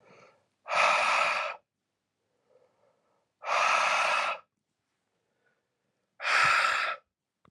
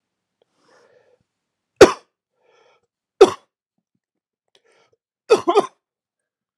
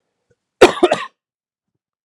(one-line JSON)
{"exhalation_length": "7.5 s", "exhalation_amplitude": 8609, "exhalation_signal_mean_std_ratio": 0.49, "three_cough_length": "6.6 s", "three_cough_amplitude": 32768, "three_cough_signal_mean_std_ratio": 0.18, "cough_length": "2.0 s", "cough_amplitude": 32768, "cough_signal_mean_std_ratio": 0.25, "survey_phase": "alpha (2021-03-01 to 2021-08-12)", "age": "18-44", "gender": "Male", "wearing_mask": "No", "symptom_cough_any": true, "symptom_headache": true, "symptom_change_to_sense_of_smell_or_taste": true, "symptom_loss_of_taste": true, "symptom_onset": "3 days", "smoker_status": "Never smoked", "respiratory_condition_asthma": false, "respiratory_condition_other": false, "recruitment_source": "Test and Trace", "submission_delay": "2 days", "covid_test_result": "Positive", "covid_test_method": "RT-qPCR", "covid_ct_value": 16.7, "covid_ct_gene": "N gene", "covid_ct_mean": 17.6, "covid_viral_load": "1700000 copies/ml", "covid_viral_load_category": "High viral load (>1M copies/ml)"}